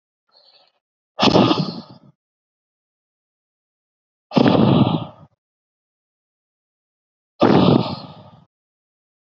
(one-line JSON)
{"exhalation_length": "9.3 s", "exhalation_amplitude": 32768, "exhalation_signal_mean_std_ratio": 0.34, "survey_phase": "beta (2021-08-13 to 2022-03-07)", "age": "45-64", "gender": "Male", "wearing_mask": "No", "symptom_cough_any": true, "symptom_headache": true, "smoker_status": "Ex-smoker", "respiratory_condition_asthma": false, "respiratory_condition_other": false, "recruitment_source": "REACT", "submission_delay": "3 days", "covid_test_result": "Negative", "covid_test_method": "RT-qPCR", "influenza_a_test_result": "Negative", "influenza_b_test_result": "Negative"}